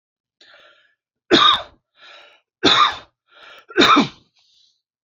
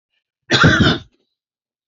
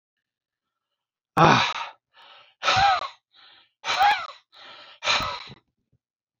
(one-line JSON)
{"three_cough_length": "5.0 s", "three_cough_amplitude": 29876, "three_cough_signal_mean_std_ratio": 0.35, "cough_length": "1.9 s", "cough_amplitude": 30533, "cough_signal_mean_std_ratio": 0.41, "exhalation_length": "6.4 s", "exhalation_amplitude": 27350, "exhalation_signal_mean_std_ratio": 0.38, "survey_phase": "beta (2021-08-13 to 2022-03-07)", "age": "65+", "gender": "Male", "wearing_mask": "No", "symptom_none": true, "smoker_status": "Never smoked", "respiratory_condition_asthma": false, "respiratory_condition_other": false, "recruitment_source": "REACT", "submission_delay": "2 days", "covid_test_result": "Negative", "covid_test_method": "RT-qPCR"}